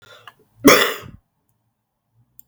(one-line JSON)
{"cough_length": "2.5 s", "cough_amplitude": 32768, "cough_signal_mean_std_ratio": 0.26, "survey_phase": "beta (2021-08-13 to 2022-03-07)", "age": "65+", "gender": "Male", "wearing_mask": "No", "symptom_cough_any": true, "symptom_runny_or_blocked_nose": true, "symptom_sore_throat": true, "symptom_fever_high_temperature": true, "smoker_status": "Never smoked", "respiratory_condition_asthma": false, "respiratory_condition_other": false, "recruitment_source": "Test and Trace", "submission_delay": "2 days", "covid_test_result": "Positive", "covid_test_method": "LFT"}